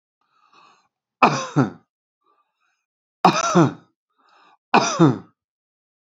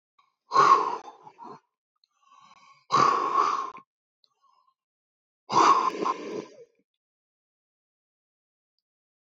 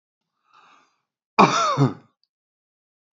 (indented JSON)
{
  "three_cough_length": "6.1 s",
  "three_cough_amplitude": 28969,
  "three_cough_signal_mean_std_ratio": 0.32,
  "exhalation_length": "9.4 s",
  "exhalation_amplitude": 16231,
  "exhalation_signal_mean_std_ratio": 0.35,
  "cough_length": "3.2 s",
  "cough_amplitude": 28340,
  "cough_signal_mean_std_ratio": 0.3,
  "survey_phase": "beta (2021-08-13 to 2022-03-07)",
  "age": "65+",
  "gender": "Male",
  "wearing_mask": "No",
  "symptom_headache": true,
  "smoker_status": "Ex-smoker",
  "respiratory_condition_asthma": false,
  "respiratory_condition_other": false,
  "recruitment_source": "REACT",
  "submission_delay": "2 days",
  "covid_test_result": "Negative",
  "covid_test_method": "RT-qPCR",
  "influenza_a_test_result": "Negative",
  "influenza_b_test_result": "Negative"
}